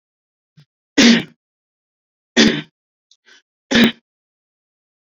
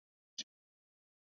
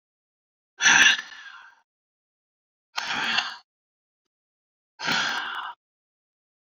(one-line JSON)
{"three_cough_length": "5.1 s", "three_cough_amplitude": 32356, "three_cough_signal_mean_std_ratio": 0.29, "cough_length": "1.4 s", "cough_amplitude": 1107, "cough_signal_mean_std_ratio": 0.13, "exhalation_length": "6.7 s", "exhalation_amplitude": 22120, "exhalation_signal_mean_std_ratio": 0.33, "survey_phase": "beta (2021-08-13 to 2022-03-07)", "age": "18-44", "gender": "Male", "wearing_mask": "No", "symptom_none": true, "smoker_status": "Never smoked", "respiratory_condition_asthma": false, "respiratory_condition_other": false, "recruitment_source": "REACT", "submission_delay": "3 days", "covid_test_result": "Negative", "covid_test_method": "RT-qPCR"}